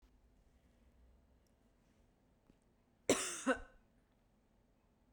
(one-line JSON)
{"cough_length": "5.1 s", "cough_amplitude": 4315, "cough_signal_mean_std_ratio": 0.23, "survey_phase": "beta (2021-08-13 to 2022-03-07)", "age": "45-64", "gender": "Female", "wearing_mask": "No", "symptom_none": true, "smoker_status": "Never smoked", "respiratory_condition_asthma": false, "respiratory_condition_other": false, "recruitment_source": "REACT", "submission_delay": "0 days", "covid_test_result": "Negative", "covid_test_method": "RT-qPCR"}